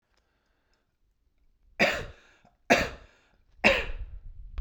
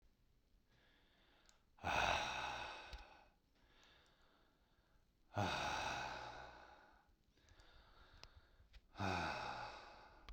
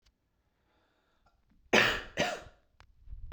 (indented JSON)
{
  "three_cough_length": "4.6 s",
  "three_cough_amplitude": 20926,
  "three_cough_signal_mean_std_ratio": 0.34,
  "exhalation_length": "10.3 s",
  "exhalation_amplitude": 2205,
  "exhalation_signal_mean_std_ratio": 0.48,
  "cough_length": "3.3 s",
  "cough_amplitude": 13035,
  "cough_signal_mean_std_ratio": 0.31,
  "survey_phase": "beta (2021-08-13 to 2022-03-07)",
  "age": "45-64",
  "gender": "Male",
  "wearing_mask": "No",
  "symptom_none": true,
  "smoker_status": "Never smoked",
  "respiratory_condition_asthma": false,
  "respiratory_condition_other": false,
  "recruitment_source": "REACT",
  "submission_delay": "5 days",
  "covid_test_result": "Negative",
  "covid_test_method": "RT-qPCR"
}